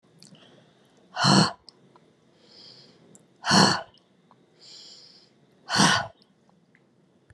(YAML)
exhalation_length: 7.3 s
exhalation_amplitude: 21745
exhalation_signal_mean_std_ratio: 0.31
survey_phase: beta (2021-08-13 to 2022-03-07)
age: 65+
gender: Female
wearing_mask: 'No'
symptom_cough_any: true
symptom_abdominal_pain: true
symptom_onset: 9 days
smoker_status: Ex-smoker
respiratory_condition_asthma: false
respiratory_condition_other: false
recruitment_source: REACT
submission_delay: 1 day
covid_test_result: Negative
covid_test_method: RT-qPCR